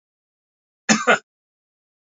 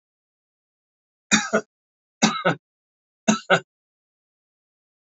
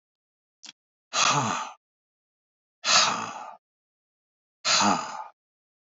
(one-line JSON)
{"cough_length": "2.1 s", "cough_amplitude": 26456, "cough_signal_mean_std_ratio": 0.24, "three_cough_length": "5.0 s", "three_cough_amplitude": 27805, "three_cough_signal_mean_std_ratio": 0.27, "exhalation_length": "6.0 s", "exhalation_amplitude": 16273, "exhalation_signal_mean_std_ratio": 0.39, "survey_phase": "beta (2021-08-13 to 2022-03-07)", "age": "65+", "gender": "Male", "wearing_mask": "No", "symptom_none": true, "smoker_status": "Ex-smoker", "respiratory_condition_asthma": false, "respiratory_condition_other": false, "recruitment_source": "REACT", "submission_delay": "2 days", "covid_test_result": "Negative", "covid_test_method": "RT-qPCR", "influenza_a_test_result": "Negative", "influenza_b_test_result": "Negative"}